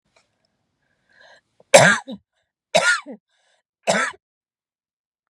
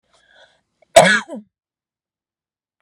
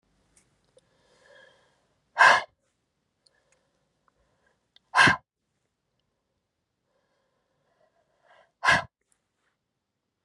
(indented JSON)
{
  "three_cough_length": "5.3 s",
  "three_cough_amplitude": 32768,
  "three_cough_signal_mean_std_ratio": 0.27,
  "cough_length": "2.8 s",
  "cough_amplitude": 32768,
  "cough_signal_mean_std_ratio": 0.23,
  "exhalation_length": "10.2 s",
  "exhalation_amplitude": 20285,
  "exhalation_signal_mean_std_ratio": 0.19,
  "survey_phase": "beta (2021-08-13 to 2022-03-07)",
  "age": "45-64",
  "gender": "Female",
  "wearing_mask": "No",
  "symptom_none": true,
  "smoker_status": "Never smoked",
  "respiratory_condition_asthma": false,
  "respiratory_condition_other": false,
  "recruitment_source": "REACT",
  "submission_delay": "1 day",
  "covid_test_result": "Negative",
  "covid_test_method": "RT-qPCR"
}